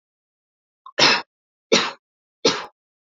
{"three_cough_length": "3.2 s", "three_cough_amplitude": 29471, "three_cough_signal_mean_std_ratio": 0.32, "survey_phase": "beta (2021-08-13 to 2022-03-07)", "age": "18-44", "gender": "Female", "wearing_mask": "No", "symptom_runny_or_blocked_nose": true, "smoker_status": "Ex-smoker", "respiratory_condition_asthma": false, "respiratory_condition_other": false, "recruitment_source": "Test and Trace", "submission_delay": "1 day", "covid_test_result": "Positive", "covid_test_method": "RT-qPCR", "covid_ct_value": 31.0, "covid_ct_gene": "ORF1ab gene", "covid_ct_mean": 31.8, "covid_viral_load": "36 copies/ml", "covid_viral_load_category": "Minimal viral load (< 10K copies/ml)"}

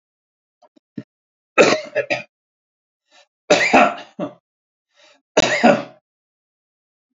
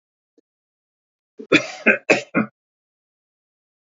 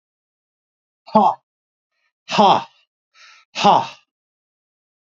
{"three_cough_length": "7.2 s", "three_cough_amplitude": 32767, "three_cough_signal_mean_std_ratio": 0.32, "cough_length": "3.8 s", "cough_amplitude": 29912, "cough_signal_mean_std_ratio": 0.26, "exhalation_length": "5.0 s", "exhalation_amplitude": 29831, "exhalation_signal_mean_std_ratio": 0.3, "survey_phase": "beta (2021-08-13 to 2022-03-07)", "age": "65+", "gender": "Male", "wearing_mask": "No", "symptom_none": true, "symptom_onset": "12 days", "smoker_status": "Ex-smoker", "respiratory_condition_asthma": false, "respiratory_condition_other": false, "recruitment_source": "REACT", "submission_delay": "3 days", "covid_test_result": "Negative", "covid_test_method": "RT-qPCR", "influenza_a_test_result": "Negative", "influenza_b_test_result": "Negative"}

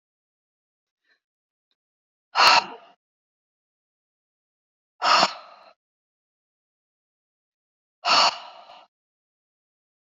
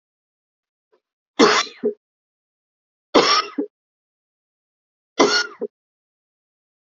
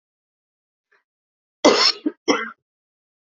{"exhalation_length": "10.1 s", "exhalation_amplitude": 25388, "exhalation_signal_mean_std_ratio": 0.23, "three_cough_length": "7.0 s", "three_cough_amplitude": 30238, "three_cough_signal_mean_std_ratio": 0.29, "cough_length": "3.3 s", "cough_amplitude": 29582, "cough_signal_mean_std_ratio": 0.29, "survey_phase": "beta (2021-08-13 to 2022-03-07)", "age": "45-64", "gender": "Female", "wearing_mask": "No", "symptom_cough_any": true, "symptom_runny_or_blocked_nose": true, "symptom_sore_throat": true, "symptom_fatigue": true, "symptom_headache": true, "symptom_other": true, "symptom_onset": "3 days", "smoker_status": "Never smoked", "respiratory_condition_asthma": false, "respiratory_condition_other": false, "recruitment_source": "Test and Trace", "submission_delay": "2 days", "covid_test_result": "Positive", "covid_test_method": "RT-qPCR", "covid_ct_value": 21.3, "covid_ct_gene": "ORF1ab gene"}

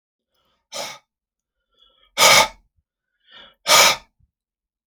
{"exhalation_length": "4.9 s", "exhalation_amplitude": 32767, "exhalation_signal_mean_std_ratio": 0.29, "survey_phase": "alpha (2021-03-01 to 2021-08-12)", "age": "45-64", "gender": "Male", "wearing_mask": "No", "symptom_none": true, "smoker_status": "Ex-smoker", "respiratory_condition_asthma": false, "respiratory_condition_other": false, "recruitment_source": "REACT", "submission_delay": "1 day", "covid_test_result": "Negative", "covid_test_method": "RT-qPCR"}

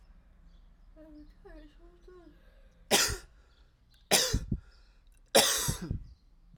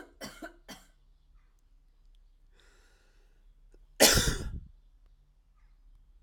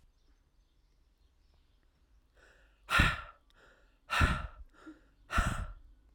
{"three_cough_length": "6.6 s", "three_cough_amplitude": 13690, "three_cough_signal_mean_std_ratio": 0.36, "cough_length": "6.2 s", "cough_amplitude": 17003, "cough_signal_mean_std_ratio": 0.25, "exhalation_length": "6.1 s", "exhalation_amplitude": 10293, "exhalation_signal_mean_std_ratio": 0.33, "survey_phase": "alpha (2021-03-01 to 2021-08-12)", "age": "18-44", "gender": "Male", "wearing_mask": "No", "symptom_change_to_sense_of_smell_or_taste": true, "symptom_onset": "4 days", "smoker_status": "Never smoked", "respiratory_condition_asthma": false, "respiratory_condition_other": false, "recruitment_source": "Test and Trace", "submission_delay": "2 days", "covid_test_result": "Positive", "covid_test_method": "RT-qPCR", "covid_ct_value": 17.6, "covid_ct_gene": "ORF1ab gene"}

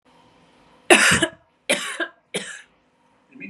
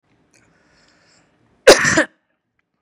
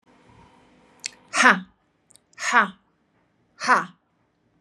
{"three_cough_length": "3.5 s", "three_cough_amplitude": 32768, "three_cough_signal_mean_std_ratio": 0.34, "cough_length": "2.8 s", "cough_amplitude": 32768, "cough_signal_mean_std_ratio": 0.25, "exhalation_length": "4.6 s", "exhalation_amplitude": 31099, "exhalation_signal_mean_std_ratio": 0.28, "survey_phase": "beta (2021-08-13 to 2022-03-07)", "age": "45-64", "gender": "Female", "wearing_mask": "No", "symptom_none": true, "smoker_status": "Ex-smoker", "respiratory_condition_asthma": false, "respiratory_condition_other": false, "recruitment_source": "REACT", "submission_delay": "0 days", "covid_test_result": "Negative", "covid_test_method": "RT-qPCR", "influenza_a_test_result": "Negative", "influenza_b_test_result": "Negative"}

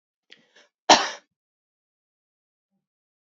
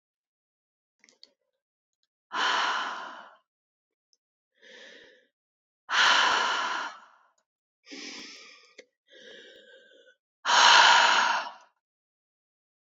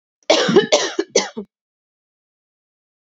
{"cough_length": "3.2 s", "cough_amplitude": 27457, "cough_signal_mean_std_ratio": 0.16, "exhalation_length": "12.9 s", "exhalation_amplitude": 18781, "exhalation_signal_mean_std_ratio": 0.35, "three_cough_length": "3.1 s", "three_cough_amplitude": 28145, "three_cough_signal_mean_std_ratio": 0.37, "survey_phase": "beta (2021-08-13 to 2022-03-07)", "age": "18-44", "gender": "Female", "wearing_mask": "No", "symptom_cough_any": true, "symptom_new_continuous_cough": true, "symptom_runny_or_blocked_nose": true, "symptom_sore_throat": true, "symptom_fatigue": true, "symptom_change_to_sense_of_smell_or_taste": true, "symptom_loss_of_taste": true, "symptom_other": true, "smoker_status": "Never smoked", "respiratory_condition_asthma": true, "respiratory_condition_other": false, "recruitment_source": "Test and Trace", "submission_delay": "2 days", "covid_test_result": "Positive", "covid_test_method": "LFT"}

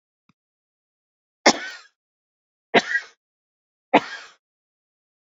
{"three_cough_length": "5.4 s", "three_cough_amplitude": 30859, "three_cough_signal_mean_std_ratio": 0.2, "survey_phase": "beta (2021-08-13 to 2022-03-07)", "age": "45-64", "gender": "Female", "wearing_mask": "No", "symptom_cough_any": true, "symptom_runny_or_blocked_nose": true, "symptom_shortness_of_breath": true, "symptom_sore_throat": true, "symptom_headache": true, "smoker_status": "Ex-smoker", "respiratory_condition_asthma": false, "respiratory_condition_other": true, "recruitment_source": "Test and Trace", "submission_delay": "2 days", "covid_test_result": "Positive", "covid_test_method": "RT-qPCR", "covid_ct_value": 27.1, "covid_ct_gene": "ORF1ab gene", "covid_ct_mean": 27.9, "covid_viral_load": "720 copies/ml", "covid_viral_load_category": "Minimal viral load (< 10K copies/ml)"}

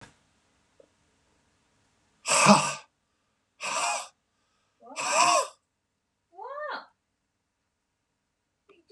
{"exhalation_length": "8.9 s", "exhalation_amplitude": 24632, "exhalation_signal_mean_std_ratio": 0.3, "survey_phase": "beta (2021-08-13 to 2022-03-07)", "age": "65+", "gender": "Male", "wearing_mask": "No", "symptom_none": true, "smoker_status": "Ex-smoker", "respiratory_condition_asthma": false, "respiratory_condition_other": false, "recruitment_source": "REACT", "submission_delay": "2 days", "covid_test_result": "Negative", "covid_test_method": "RT-qPCR", "influenza_a_test_result": "Negative", "influenza_b_test_result": "Negative"}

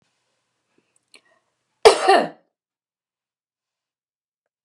{"cough_length": "4.6 s", "cough_amplitude": 32768, "cough_signal_mean_std_ratio": 0.2, "survey_phase": "beta (2021-08-13 to 2022-03-07)", "age": "45-64", "gender": "Female", "wearing_mask": "No", "symptom_cough_any": true, "symptom_fatigue": true, "smoker_status": "Never smoked", "respiratory_condition_asthma": false, "respiratory_condition_other": false, "recruitment_source": "REACT", "submission_delay": "2 days", "covid_test_result": "Negative", "covid_test_method": "RT-qPCR", "influenza_a_test_result": "Negative", "influenza_b_test_result": "Negative"}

